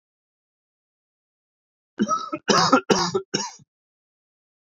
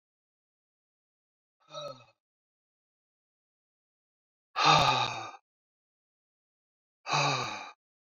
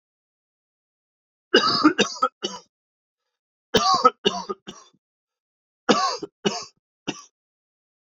cough_length: 4.6 s
cough_amplitude: 24704
cough_signal_mean_std_ratio: 0.35
exhalation_length: 8.1 s
exhalation_amplitude: 10429
exhalation_signal_mean_std_ratio: 0.29
three_cough_length: 8.1 s
three_cough_amplitude: 26341
three_cough_signal_mean_std_ratio: 0.33
survey_phase: beta (2021-08-13 to 2022-03-07)
age: 18-44
gender: Male
wearing_mask: 'No'
symptom_none: true
smoker_status: Never smoked
respiratory_condition_asthma: false
respiratory_condition_other: false
recruitment_source: Test and Trace
submission_delay: 1 day
covid_test_result: Positive
covid_test_method: RT-qPCR
covid_ct_value: 20.8
covid_ct_gene: ORF1ab gene
covid_ct_mean: 21.1
covid_viral_load: 120000 copies/ml
covid_viral_load_category: Low viral load (10K-1M copies/ml)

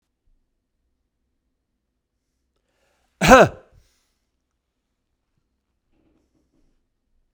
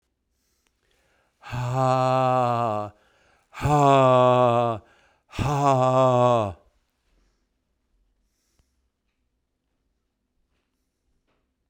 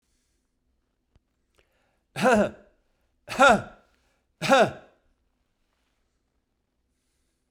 cough_length: 7.3 s
cough_amplitude: 32768
cough_signal_mean_std_ratio: 0.15
exhalation_length: 11.7 s
exhalation_amplitude: 18833
exhalation_signal_mean_std_ratio: 0.47
three_cough_length: 7.5 s
three_cough_amplitude: 18381
three_cough_signal_mean_std_ratio: 0.26
survey_phase: beta (2021-08-13 to 2022-03-07)
age: 65+
gender: Male
wearing_mask: 'No'
symptom_runny_or_blocked_nose: true
symptom_onset: 3 days
smoker_status: Never smoked
respiratory_condition_asthma: false
respiratory_condition_other: false
recruitment_source: Test and Trace
submission_delay: 2 days
covid_test_result: Positive
covid_test_method: RT-qPCR
covid_ct_value: 22.4
covid_ct_gene: ORF1ab gene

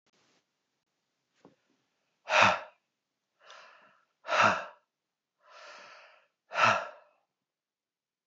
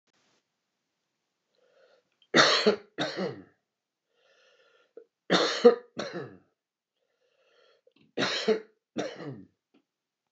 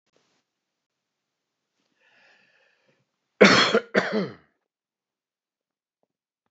exhalation_length: 8.3 s
exhalation_amplitude: 13797
exhalation_signal_mean_std_ratio: 0.27
three_cough_length: 10.3 s
three_cough_amplitude: 17464
three_cough_signal_mean_std_ratio: 0.29
cough_length: 6.5 s
cough_amplitude: 29430
cough_signal_mean_std_ratio: 0.22
survey_phase: beta (2021-08-13 to 2022-03-07)
age: 45-64
gender: Male
wearing_mask: 'No'
symptom_sore_throat: true
symptom_fatigue: true
symptom_change_to_sense_of_smell_or_taste: true
symptom_loss_of_taste: true
symptom_onset: 4 days
smoker_status: Never smoked
respiratory_condition_asthma: false
respiratory_condition_other: false
recruitment_source: Test and Trace
submission_delay: 2 days
covid_test_result: Positive
covid_test_method: RT-qPCR
covid_ct_value: 22.2
covid_ct_gene: ORF1ab gene
covid_ct_mean: 22.4
covid_viral_load: 44000 copies/ml
covid_viral_load_category: Low viral load (10K-1M copies/ml)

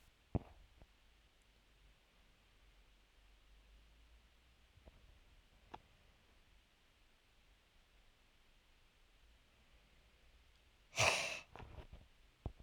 exhalation_length: 12.6 s
exhalation_amplitude: 4161
exhalation_signal_mean_std_ratio: 0.25
survey_phase: alpha (2021-03-01 to 2021-08-12)
age: 18-44
gender: Male
wearing_mask: 'No'
symptom_none: true
smoker_status: Current smoker (11 or more cigarettes per day)
respiratory_condition_asthma: false
respiratory_condition_other: false
recruitment_source: REACT
submission_delay: 0 days
covid_test_result: Negative
covid_test_method: RT-qPCR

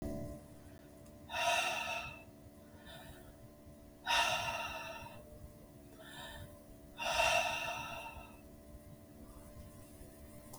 exhalation_length: 10.6 s
exhalation_amplitude: 3536
exhalation_signal_mean_std_ratio: 0.58
survey_phase: beta (2021-08-13 to 2022-03-07)
age: 65+
gender: Female
wearing_mask: 'No'
symptom_cough_any: true
symptom_runny_or_blocked_nose: true
smoker_status: Ex-smoker
respiratory_condition_asthma: false
respiratory_condition_other: false
recruitment_source: Test and Trace
submission_delay: 1 day
covid_test_result: Positive
covid_test_method: RT-qPCR
covid_ct_value: 19.0
covid_ct_gene: ORF1ab gene
covid_ct_mean: 19.6
covid_viral_load: 380000 copies/ml
covid_viral_load_category: Low viral load (10K-1M copies/ml)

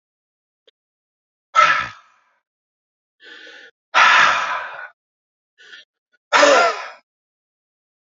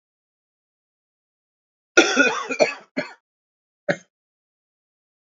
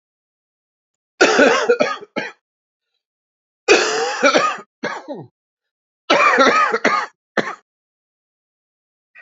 exhalation_length: 8.2 s
exhalation_amplitude: 32413
exhalation_signal_mean_std_ratio: 0.34
cough_length: 5.3 s
cough_amplitude: 28784
cough_signal_mean_std_ratio: 0.27
three_cough_length: 9.2 s
three_cough_amplitude: 30482
three_cough_signal_mean_std_ratio: 0.44
survey_phase: alpha (2021-03-01 to 2021-08-12)
age: 45-64
gender: Female
wearing_mask: 'No'
symptom_cough_any: true
symptom_new_continuous_cough: true
symptom_fatigue: true
symptom_headache: true
symptom_change_to_sense_of_smell_or_taste: true
symptom_onset: 4 days
smoker_status: Never smoked
respiratory_condition_asthma: false
respiratory_condition_other: false
recruitment_source: Test and Trace
submission_delay: 2 days
covid_test_result: Positive
covid_test_method: RT-qPCR
covid_ct_value: 19.1
covid_ct_gene: ORF1ab gene
covid_ct_mean: 19.7
covid_viral_load: 340000 copies/ml
covid_viral_load_category: Low viral load (10K-1M copies/ml)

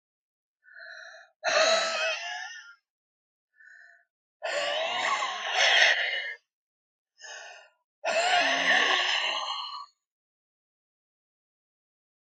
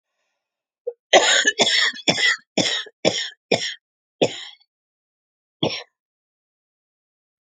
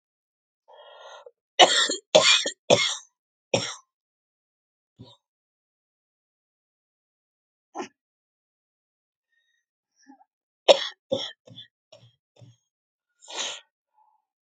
exhalation_length: 12.4 s
exhalation_amplitude: 16499
exhalation_signal_mean_std_ratio: 0.51
cough_length: 7.5 s
cough_amplitude: 32469
cough_signal_mean_std_ratio: 0.38
three_cough_length: 14.6 s
three_cough_amplitude: 30663
three_cough_signal_mean_std_ratio: 0.22
survey_phase: beta (2021-08-13 to 2022-03-07)
age: 45-64
gender: Female
wearing_mask: 'No'
symptom_cough_any: true
symptom_new_continuous_cough: true
symptom_runny_or_blocked_nose: true
symptom_fatigue: true
symptom_fever_high_temperature: true
symptom_headache: true
symptom_change_to_sense_of_smell_or_taste: true
smoker_status: Current smoker (e-cigarettes or vapes only)
respiratory_condition_asthma: true
respiratory_condition_other: false
recruitment_source: Test and Trace
submission_delay: 3 days
covid_test_result: Positive
covid_test_method: RT-qPCR
covid_ct_value: 15.1
covid_ct_gene: ORF1ab gene
covid_ct_mean: 15.8
covid_viral_load: 6600000 copies/ml
covid_viral_load_category: High viral load (>1M copies/ml)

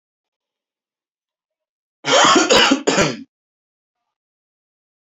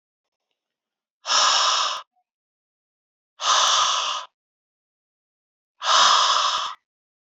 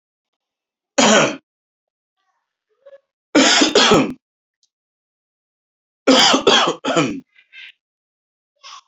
cough_length: 5.1 s
cough_amplitude: 28896
cough_signal_mean_std_ratio: 0.35
exhalation_length: 7.3 s
exhalation_amplitude: 20976
exhalation_signal_mean_std_ratio: 0.47
three_cough_length: 8.9 s
three_cough_amplitude: 32767
three_cough_signal_mean_std_ratio: 0.39
survey_phase: beta (2021-08-13 to 2022-03-07)
age: 18-44
gender: Male
wearing_mask: 'No'
symptom_none: true
smoker_status: Never smoked
respiratory_condition_asthma: false
respiratory_condition_other: false
recruitment_source: REACT
submission_delay: 7 days
covid_test_result: Negative
covid_test_method: RT-qPCR
influenza_a_test_result: Negative
influenza_b_test_result: Negative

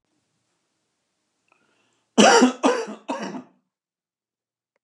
cough_length: 4.8 s
cough_amplitude: 31151
cough_signal_mean_std_ratio: 0.29
survey_phase: alpha (2021-03-01 to 2021-08-12)
age: 65+
gender: Male
wearing_mask: 'No'
symptom_none: true
smoker_status: Never smoked
respiratory_condition_asthma: false
respiratory_condition_other: false
recruitment_source: REACT
submission_delay: 2 days
covid_test_result: Negative
covid_test_method: RT-qPCR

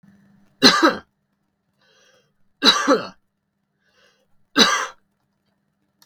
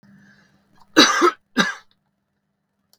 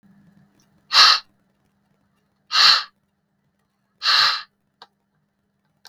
three_cough_length: 6.1 s
three_cough_amplitude: 32768
three_cough_signal_mean_std_ratio: 0.3
cough_length: 3.0 s
cough_amplitude: 32768
cough_signal_mean_std_ratio: 0.31
exhalation_length: 5.9 s
exhalation_amplitude: 32768
exhalation_signal_mean_std_ratio: 0.31
survey_phase: beta (2021-08-13 to 2022-03-07)
age: 45-64
gender: Male
wearing_mask: 'No'
symptom_none: true
smoker_status: Never smoked
respiratory_condition_asthma: false
respiratory_condition_other: false
recruitment_source: REACT
submission_delay: 1 day
covid_test_result: Negative
covid_test_method: RT-qPCR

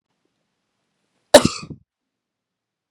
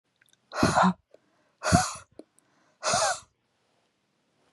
cough_length: 2.9 s
cough_amplitude: 32768
cough_signal_mean_std_ratio: 0.15
exhalation_length: 4.5 s
exhalation_amplitude: 17105
exhalation_signal_mean_std_ratio: 0.36
survey_phase: beta (2021-08-13 to 2022-03-07)
age: 18-44
gender: Female
wearing_mask: 'No'
symptom_none: true
smoker_status: Ex-smoker
respiratory_condition_asthma: false
respiratory_condition_other: false
recruitment_source: REACT
submission_delay: 2 days
covid_test_result: Negative
covid_test_method: RT-qPCR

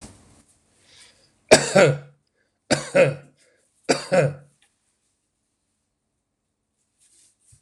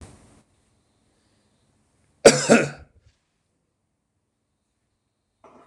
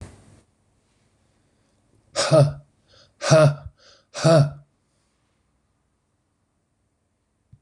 three_cough_length: 7.6 s
three_cough_amplitude: 26028
three_cough_signal_mean_std_ratio: 0.27
cough_length: 5.7 s
cough_amplitude: 26028
cough_signal_mean_std_ratio: 0.18
exhalation_length: 7.6 s
exhalation_amplitude: 25792
exhalation_signal_mean_std_ratio: 0.28
survey_phase: beta (2021-08-13 to 2022-03-07)
age: 45-64
gender: Male
wearing_mask: 'No'
symptom_none: true
smoker_status: Ex-smoker
respiratory_condition_asthma: false
respiratory_condition_other: false
recruitment_source: REACT
submission_delay: 1 day
covid_test_result: Negative
covid_test_method: RT-qPCR
influenza_a_test_result: Unknown/Void
influenza_b_test_result: Unknown/Void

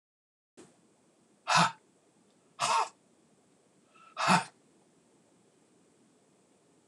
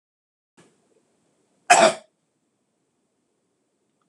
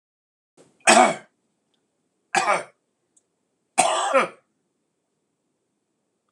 exhalation_length: 6.9 s
exhalation_amplitude: 9524
exhalation_signal_mean_std_ratio: 0.27
cough_length: 4.1 s
cough_amplitude: 25997
cough_signal_mean_std_ratio: 0.19
three_cough_length: 6.3 s
three_cough_amplitude: 26027
three_cough_signal_mean_std_ratio: 0.29
survey_phase: beta (2021-08-13 to 2022-03-07)
age: 65+
gender: Male
wearing_mask: 'No'
symptom_cough_any: true
smoker_status: Never smoked
respiratory_condition_asthma: false
respiratory_condition_other: false
recruitment_source: REACT
submission_delay: 2 days
covid_test_result: Negative
covid_test_method: RT-qPCR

